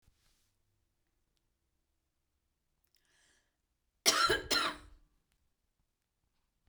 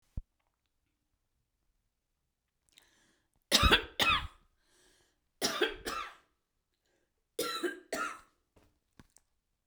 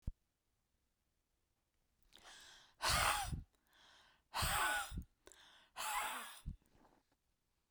{"cough_length": "6.7 s", "cough_amplitude": 8221, "cough_signal_mean_std_ratio": 0.24, "three_cough_length": "9.7 s", "three_cough_amplitude": 11624, "three_cough_signal_mean_std_ratio": 0.29, "exhalation_length": "7.7 s", "exhalation_amplitude": 2881, "exhalation_signal_mean_std_ratio": 0.41, "survey_phase": "beta (2021-08-13 to 2022-03-07)", "age": "65+", "gender": "Female", "wearing_mask": "No", "symptom_none": true, "smoker_status": "Never smoked", "respiratory_condition_asthma": false, "respiratory_condition_other": false, "recruitment_source": "REACT", "submission_delay": "1 day", "covid_test_result": "Negative", "covid_test_method": "RT-qPCR"}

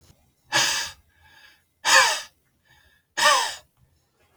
{"exhalation_length": "4.4 s", "exhalation_amplitude": 23288, "exhalation_signal_mean_std_ratio": 0.38, "survey_phase": "beta (2021-08-13 to 2022-03-07)", "age": "45-64", "gender": "Male", "wearing_mask": "No", "symptom_runny_or_blocked_nose": true, "smoker_status": "Never smoked", "respiratory_condition_asthma": false, "respiratory_condition_other": false, "recruitment_source": "REACT", "submission_delay": "6 days", "covid_test_result": "Negative", "covid_test_method": "RT-qPCR"}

